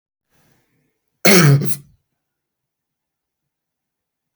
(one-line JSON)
{"cough_length": "4.4 s", "cough_amplitude": 32768, "cough_signal_mean_std_ratio": 0.27, "survey_phase": "beta (2021-08-13 to 2022-03-07)", "age": "45-64", "gender": "Male", "wearing_mask": "No", "symptom_none": true, "smoker_status": "Never smoked", "respiratory_condition_asthma": false, "respiratory_condition_other": false, "recruitment_source": "REACT", "submission_delay": "2 days", "covid_test_result": "Negative", "covid_test_method": "RT-qPCR", "influenza_a_test_result": "Negative", "influenza_b_test_result": "Negative"}